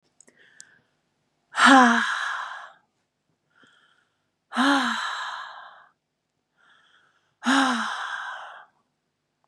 {"exhalation_length": "9.5 s", "exhalation_amplitude": 25250, "exhalation_signal_mean_std_ratio": 0.36, "survey_phase": "beta (2021-08-13 to 2022-03-07)", "age": "18-44", "gender": "Female", "wearing_mask": "No", "symptom_none": true, "smoker_status": "Never smoked", "respiratory_condition_asthma": true, "respiratory_condition_other": false, "recruitment_source": "REACT", "submission_delay": "1 day", "covid_test_result": "Negative", "covid_test_method": "RT-qPCR", "influenza_a_test_result": "Negative", "influenza_b_test_result": "Negative"}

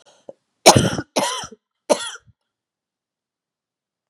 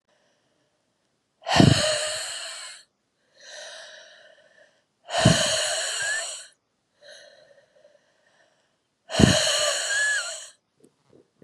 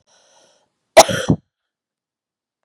{"three_cough_length": "4.1 s", "three_cough_amplitude": 32768, "three_cough_signal_mean_std_ratio": 0.26, "exhalation_length": "11.4 s", "exhalation_amplitude": 31663, "exhalation_signal_mean_std_ratio": 0.41, "cough_length": "2.6 s", "cough_amplitude": 32768, "cough_signal_mean_std_ratio": 0.21, "survey_phase": "beta (2021-08-13 to 2022-03-07)", "age": "18-44", "gender": "Female", "wearing_mask": "No", "symptom_cough_any": true, "symptom_new_continuous_cough": true, "symptom_runny_or_blocked_nose": true, "symptom_sore_throat": true, "symptom_headache": true, "symptom_other": true, "symptom_onset": "2 days", "smoker_status": "Never smoked", "respiratory_condition_asthma": true, "respiratory_condition_other": false, "recruitment_source": "Test and Trace", "submission_delay": "1 day", "covid_test_result": "Positive", "covid_test_method": "RT-qPCR", "covid_ct_value": 24.9, "covid_ct_gene": "ORF1ab gene", "covid_ct_mean": 25.5, "covid_viral_load": "4300 copies/ml", "covid_viral_load_category": "Minimal viral load (< 10K copies/ml)"}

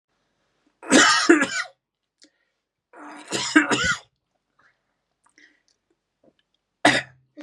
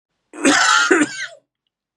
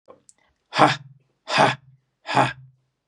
{"three_cough_length": "7.4 s", "three_cough_amplitude": 30821, "three_cough_signal_mean_std_ratio": 0.33, "cough_length": "2.0 s", "cough_amplitude": 30286, "cough_signal_mean_std_ratio": 0.54, "exhalation_length": "3.1 s", "exhalation_amplitude": 32184, "exhalation_signal_mean_std_ratio": 0.35, "survey_phase": "beta (2021-08-13 to 2022-03-07)", "age": "45-64", "gender": "Male", "wearing_mask": "No", "symptom_sore_throat": true, "symptom_change_to_sense_of_smell_or_taste": true, "symptom_onset": "6 days", "smoker_status": "Never smoked", "respiratory_condition_asthma": false, "respiratory_condition_other": false, "recruitment_source": "Test and Trace", "submission_delay": "2 days", "covid_test_result": "Positive", "covid_test_method": "RT-qPCR", "covid_ct_value": 17.5, "covid_ct_gene": "ORF1ab gene", "covid_ct_mean": 17.5, "covid_viral_load": "1800000 copies/ml", "covid_viral_load_category": "High viral load (>1M copies/ml)"}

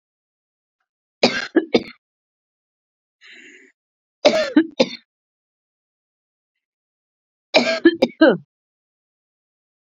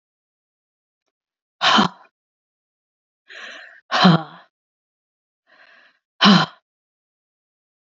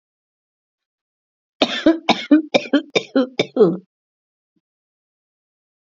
{"three_cough_length": "9.8 s", "three_cough_amplitude": 29401, "three_cough_signal_mean_std_ratio": 0.26, "exhalation_length": "7.9 s", "exhalation_amplitude": 29029, "exhalation_signal_mean_std_ratio": 0.26, "cough_length": "5.8 s", "cough_amplitude": 29062, "cough_signal_mean_std_ratio": 0.32, "survey_phase": "beta (2021-08-13 to 2022-03-07)", "age": "45-64", "gender": "Female", "wearing_mask": "No", "symptom_none": true, "smoker_status": "Never smoked", "respiratory_condition_asthma": true, "respiratory_condition_other": false, "recruitment_source": "REACT", "submission_delay": "2 days", "covid_test_result": "Negative", "covid_test_method": "RT-qPCR", "influenza_a_test_result": "Negative", "influenza_b_test_result": "Negative"}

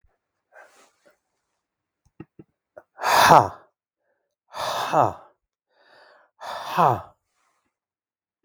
{"exhalation_length": "8.4 s", "exhalation_amplitude": 32766, "exhalation_signal_mean_std_ratio": 0.27, "survey_phase": "beta (2021-08-13 to 2022-03-07)", "age": "65+", "gender": "Male", "wearing_mask": "No", "symptom_none": true, "smoker_status": "Never smoked", "respiratory_condition_asthma": false, "respiratory_condition_other": false, "recruitment_source": "REACT", "submission_delay": "1 day", "covid_test_result": "Negative", "covid_test_method": "RT-qPCR"}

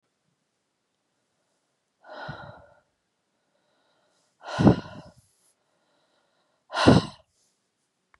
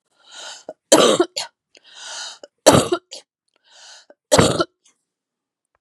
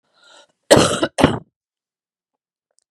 {"exhalation_length": "8.2 s", "exhalation_amplitude": 24373, "exhalation_signal_mean_std_ratio": 0.2, "three_cough_length": "5.8 s", "three_cough_amplitude": 32768, "three_cough_signal_mean_std_ratio": 0.32, "cough_length": "2.9 s", "cough_amplitude": 32768, "cough_signal_mean_std_ratio": 0.29, "survey_phase": "beta (2021-08-13 to 2022-03-07)", "age": "45-64", "gender": "Female", "wearing_mask": "No", "symptom_cough_any": true, "symptom_new_continuous_cough": true, "symptom_runny_or_blocked_nose": true, "symptom_sore_throat": true, "symptom_diarrhoea": true, "symptom_fatigue": true, "symptom_fever_high_temperature": true, "symptom_headache": true, "symptom_change_to_sense_of_smell_or_taste": true, "symptom_loss_of_taste": true, "symptom_other": true, "smoker_status": "Never smoked", "respiratory_condition_asthma": false, "respiratory_condition_other": false, "recruitment_source": "Test and Trace", "submission_delay": "1 day", "covid_test_result": "Positive", "covid_test_method": "LFT"}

